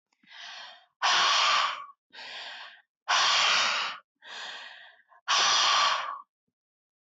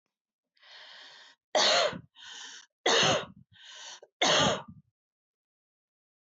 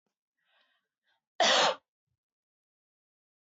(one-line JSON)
{"exhalation_length": "7.1 s", "exhalation_amplitude": 8349, "exhalation_signal_mean_std_ratio": 0.57, "three_cough_length": "6.4 s", "three_cough_amplitude": 8791, "three_cough_signal_mean_std_ratio": 0.39, "cough_length": "3.4 s", "cough_amplitude": 7617, "cough_signal_mean_std_ratio": 0.26, "survey_phase": "beta (2021-08-13 to 2022-03-07)", "age": "45-64", "gender": "Female", "wearing_mask": "No", "symptom_none": true, "smoker_status": "Never smoked", "respiratory_condition_asthma": false, "respiratory_condition_other": false, "recruitment_source": "REACT", "submission_delay": "2 days", "covid_test_result": "Negative", "covid_test_method": "RT-qPCR", "influenza_a_test_result": "Unknown/Void", "influenza_b_test_result": "Unknown/Void"}